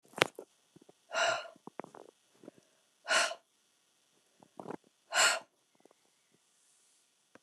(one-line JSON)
{"exhalation_length": "7.4 s", "exhalation_amplitude": 24949, "exhalation_signal_mean_std_ratio": 0.28, "survey_phase": "alpha (2021-03-01 to 2021-08-12)", "age": "65+", "gender": "Female", "wearing_mask": "No", "symptom_none": true, "smoker_status": "Ex-smoker", "respiratory_condition_asthma": false, "respiratory_condition_other": false, "recruitment_source": "REACT", "submission_delay": "3 days", "covid_test_result": "Negative", "covid_test_method": "RT-qPCR"}